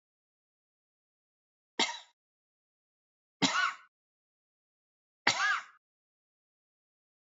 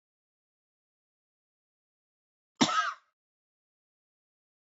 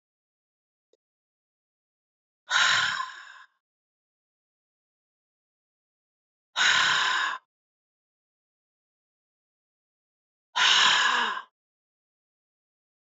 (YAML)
three_cough_length: 7.3 s
three_cough_amplitude: 9925
three_cough_signal_mean_std_ratio: 0.25
cough_length: 4.6 s
cough_amplitude: 10841
cough_signal_mean_std_ratio: 0.19
exhalation_length: 13.1 s
exhalation_amplitude: 14968
exhalation_signal_mean_std_ratio: 0.33
survey_phase: beta (2021-08-13 to 2022-03-07)
age: 45-64
gender: Female
wearing_mask: 'No'
symptom_none: true
smoker_status: Never smoked
respiratory_condition_asthma: false
respiratory_condition_other: false
recruitment_source: REACT
submission_delay: 3 days
covid_test_result: Negative
covid_test_method: RT-qPCR
influenza_a_test_result: Negative
influenza_b_test_result: Negative